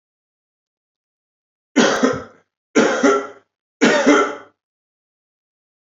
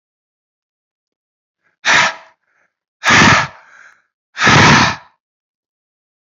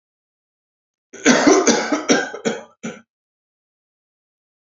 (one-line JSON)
{"three_cough_length": "6.0 s", "three_cough_amplitude": 27603, "three_cough_signal_mean_std_ratio": 0.39, "exhalation_length": "6.4 s", "exhalation_amplitude": 31677, "exhalation_signal_mean_std_ratio": 0.37, "cough_length": "4.7 s", "cough_amplitude": 30046, "cough_signal_mean_std_ratio": 0.37, "survey_phase": "beta (2021-08-13 to 2022-03-07)", "age": "18-44", "gender": "Male", "wearing_mask": "No", "symptom_cough_any": true, "symptom_runny_or_blocked_nose": true, "symptom_onset": "12 days", "smoker_status": "Never smoked", "respiratory_condition_asthma": true, "respiratory_condition_other": false, "recruitment_source": "REACT", "submission_delay": "5 days", "covid_test_result": "Negative", "covid_test_method": "RT-qPCR", "influenza_a_test_result": "Negative", "influenza_b_test_result": "Negative"}